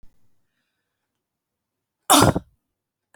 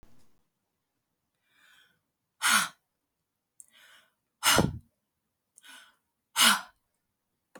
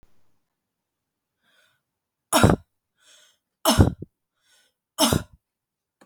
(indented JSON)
{
  "cough_length": "3.2 s",
  "cough_amplitude": 32372,
  "cough_signal_mean_std_ratio": 0.22,
  "exhalation_length": "7.6 s",
  "exhalation_amplitude": 15173,
  "exhalation_signal_mean_std_ratio": 0.25,
  "three_cough_length": "6.1 s",
  "three_cough_amplitude": 32255,
  "three_cough_signal_mean_std_ratio": 0.25,
  "survey_phase": "beta (2021-08-13 to 2022-03-07)",
  "age": "45-64",
  "gender": "Female",
  "wearing_mask": "No",
  "symptom_none": true,
  "smoker_status": "Prefer not to say",
  "respiratory_condition_asthma": false,
  "respiratory_condition_other": false,
  "recruitment_source": "REACT",
  "submission_delay": "2 days",
  "covid_test_result": "Negative",
  "covid_test_method": "RT-qPCR",
  "influenza_a_test_result": "Negative",
  "influenza_b_test_result": "Negative"
}